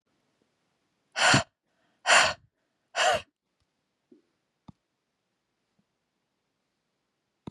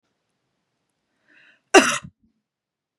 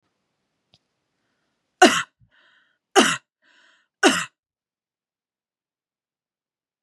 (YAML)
exhalation_length: 7.5 s
exhalation_amplitude: 16259
exhalation_signal_mean_std_ratio: 0.25
cough_length: 3.0 s
cough_amplitude: 32767
cough_signal_mean_std_ratio: 0.18
three_cough_length: 6.8 s
three_cough_amplitude: 32021
three_cough_signal_mean_std_ratio: 0.21
survey_phase: beta (2021-08-13 to 2022-03-07)
age: 45-64
gender: Female
wearing_mask: 'No'
symptom_none: true
smoker_status: Never smoked
respiratory_condition_asthma: false
respiratory_condition_other: false
recruitment_source: REACT
submission_delay: 1 day
covid_test_result: Negative
covid_test_method: RT-qPCR